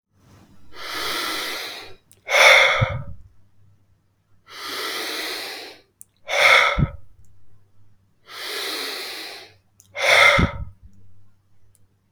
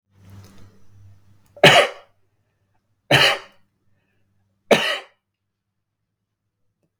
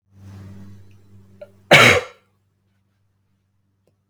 {
  "exhalation_length": "12.1 s",
  "exhalation_amplitude": 32766,
  "exhalation_signal_mean_std_ratio": 0.44,
  "three_cough_length": "7.0 s",
  "three_cough_amplitude": 32768,
  "three_cough_signal_mean_std_ratio": 0.26,
  "cough_length": "4.1 s",
  "cough_amplitude": 32768,
  "cough_signal_mean_std_ratio": 0.24,
  "survey_phase": "beta (2021-08-13 to 2022-03-07)",
  "age": "18-44",
  "gender": "Male",
  "wearing_mask": "No",
  "symptom_runny_or_blocked_nose": true,
  "symptom_onset": "12 days",
  "smoker_status": "Never smoked",
  "respiratory_condition_asthma": false,
  "respiratory_condition_other": false,
  "recruitment_source": "REACT",
  "submission_delay": "0 days",
  "covid_test_result": "Negative",
  "covid_test_method": "RT-qPCR",
  "influenza_a_test_result": "Unknown/Void",
  "influenza_b_test_result": "Unknown/Void"
}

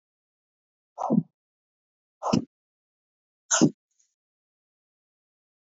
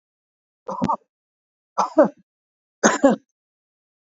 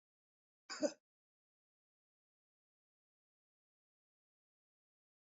{
  "exhalation_length": "5.7 s",
  "exhalation_amplitude": 14529,
  "exhalation_signal_mean_std_ratio": 0.22,
  "three_cough_length": "4.1 s",
  "three_cough_amplitude": 29314,
  "three_cough_signal_mean_std_ratio": 0.29,
  "cough_length": "5.2 s",
  "cough_amplitude": 2164,
  "cough_signal_mean_std_ratio": 0.12,
  "survey_phase": "alpha (2021-03-01 to 2021-08-12)",
  "age": "45-64",
  "gender": "Male",
  "wearing_mask": "No",
  "symptom_none": true,
  "smoker_status": "Ex-smoker",
  "respiratory_condition_asthma": false,
  "respiratory_condition_other": false,
  "recruitment_source": "REACT",
  "submission_delay": "1 day",
  "covid_test_result": "Negative",
  "covid_test_method": "RT-qPCR"
}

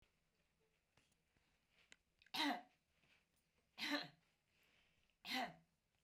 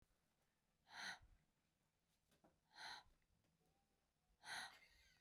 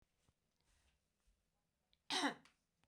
{
  "three_cough_length": "6.0 s",
  "three_cough_amplitude": 1020,
  "three_cough_signal_mean_std_ratio": 0.3,
  "exhalation_length": "5.2 s",
  "exhalation_amplitude": 338,
  "exhalation_signal_mean_std_ratio": 0.38,
  "cough_length": "2.9 s",
  "cough_amplitude": 1570,
  "cough_signal_mean_std_ratio": 0.24,
  "survey_phase": "beta (2021-08-13 to 2022-03-07)",
  "age": "65+",
  "gender": "Female",
  "wearing_mask": "No",
  "symptom_none": true,
  "smoker_status": "Never smoked",
  "respiratory_condition_asthma": false,
  "respiratory_condition_other": false,
  "recruitment_source": "REACT",
  "submission_delay": "2 days",
  "covid_test_result": "Negative",
  "covid_test_method": "RT-qPCR",
  "influenza_a_test_result": "Negative",
  "influenza_b_test_result": "Negative"
}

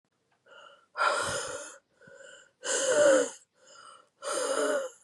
{
  "exhalation_length": "5.0 s",
  "exhalation_amplitude": 8328,
  "exhalation_signal_mean_std_ratio": 0.52,
  "survey_phase": "beta (2021-08-13 to 2022-03-07)",
  "age": "18-44",
  "gender": "Female",
  "wearing_mask": "No",
  "symptom_cough_any": true,
  "symptom_runny_or_blocked_nose": true,
  "symptom_shortness_of_breath": true,
  "symptom_fatigue": true,
  "symptom_headache": true,
  "symptom_onset": "4 days",
  "smoker_status": "Never smoked",
  "respiratory_condition_asthma": false,
  "respiratory_condition_other": false,
  "recruitment_source": "Test and Trace",
  "submission_delay": "2 days",
  "covid_test_result": "Negative",
  "covid_test_method": "RT-qPCR"
}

